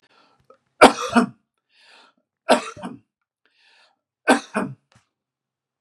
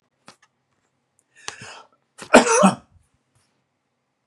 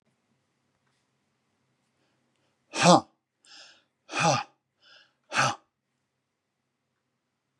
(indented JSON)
{
  "three_cough_length": "5.8 s",
  "three_cough_amplitude": 32768,
  "three_cough_signal_mean_std_ratio": 0.24,
  "cough_length": "4.3 s",
  "cough_amplitude": 32768,
  "cough_signal_mean_std_ratio": 0.24,
  "exhalation_length": "7.6 s",
  "exhalation_amplitude": 24465,
  "exhalation_signal_mean_std_ratio": 0.22,
  "survey_phase": "beta (2021-08-13 to 2022-03-07)",
  "age": "45-64",
  "gender": "Male",
  "wearing_mask": "No",
  "symptom_none": true,
  "smoker_status": "Never smoked",
  "respiratory_condition_asthma": false,
  "respiratory_condition_other": false,
  "recruitment_source": "REACT",
  "submission_delay": "1 day",
  "covid_test_result": "Negative",
  "covid_test_method": "RT-qPCR",
  "influenza_a_test_result": "Unknown/Void",
  "influenza_b_test_result": "Unknown/Void"
}